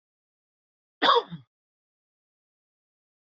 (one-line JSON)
{"cough_length": "3.3 s", "cough_amplitude": 12506, "cough_signal_mean_std_ratio": 0.2, "survey_phase": "beta (2021-08-13 to 2022-03-07)", "age": "18-44", "gender": "Male", "wearing_mask": "No", "symptom_cough_any": true, "symptom_new_continuous_cough": true, "symptom_runny_or_blocked_nose": true, "symptom_sore_throat": true, "symptom_fatigue": true, "symptom_change_to_sense_of_smell_or_taste": true, "symptom_onset": "2 days", "smoker_status": "Never smoked", "respiratory_condition_asthma": false, "respiratory_condition_other": false, "recruitment_source": "Test and Trace", "submission_delay": "1 day", "covid_test_result": "Positive", "covid_test_method": "RT-qPCR", "covid_ct_value": 24.2, "covid_ct_gene": "ORF1ab gene"}